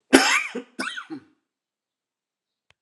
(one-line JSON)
{"cough_length": "2.8 s", "cough_amplitude": 32768, "cough_signal_mean_std_ratio": 0.3, "survey_phase": "alpha (2021-03-01 to 2021-08-12)", "age": "45-64", "gender": "Male", "wearing_mask": "No", "symptom_cough_any": true, "symptom_fatigue": true, "symptom_headache": true, "smoker_status": "Never smoked", "respiratory_condition_asthma": false, "respiratory_condition_other": false, "recruitment_source": "Test and Trace", "submission_delay": "1 day", "covid_test_result": "Positive", "covid_test_method": "RT-qPCR", "covid_ct_value": 29.5, "covid_ct_gene": "ORF1ab gene"}